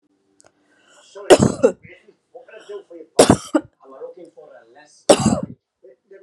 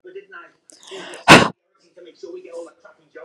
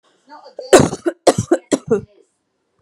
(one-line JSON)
{"three_cough_length": "6.2 s", "three_cough_amplitude": 32768, "three_cough_signal_mean_std_ratio": 0.28, "exhalation_length": "3.2 s", "exhalation_amplitude": 32768, "exhalation_signal_mean_std_ratio": 0.24, "cough_length": "2.8 s", "cough_amplitude": 32768, "cough_signal_mean_std_ratio": 0.34, "survey_phase": "beta (2021-08-13 to 2022-03-07)", "age": "18-44", "gender": "Female", "wearing_mask": "No", "symptom_none": true, "smoker_status": "Ex-smoker", "respiratory_condition_asthma": false, "respiratory_condition_other": false, "recruitment_source": "REACT", "submission_delay": "2 days", "covid_test_result": "Negative", "covid_test_method": "RT-qPCR", "influenza_a_test_result": "Negative", "influenza_b_test_result": "Negative"}